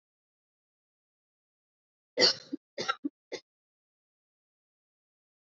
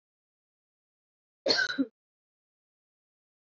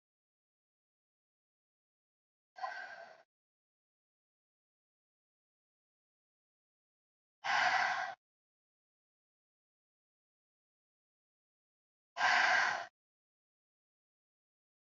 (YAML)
three_cough_length: 5.5 s
three_cough_amplitude: 12232
three_cough_signal_mean_std_ratio: 0.18
cough_length: 3.5 s
cough_amplitude: 8673
cough_signal_mean_std_ratio: 0.24
exhalation_length: 14.8 s
exhalation_amplitude: 3902
exhalation_signal_mean_std_ratio: 0.24
survey_phase: beta (2021-08-13 to 2022-03-07)
age: 18-44
gender: Female
wearing_mask: 'No'
symptom_new_continuous_cough: true
symptom_runny_or_blocked_nose: true
symptom_fatigue: true
smoker_status: Ex-smoker
respiratory_condition_asthma: false
respiratory_condition_other: false
recruitment_source: Test and Trace
submission_delay: -1 day
covid_test_result: Negative
covid_test_method: LFT